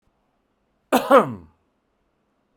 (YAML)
cough_length: 2.6 s
cough_amplitude: 28536
cough_signal_mean_std_ratio: 0.26
survey_phase: beta (2021-08-13 to 2022-03-07)
age: 45-64
gender: Male
wearing_mask: 'No'
symptom_none: true
symptom_onset: 12 days
smoker_status: Ex-smoker
respiratory_condition_asthma: false
respiratory_condition_other: false
recruitment_source: REACT
submission_delay: 1 day
covid_test_method: RT-qPCR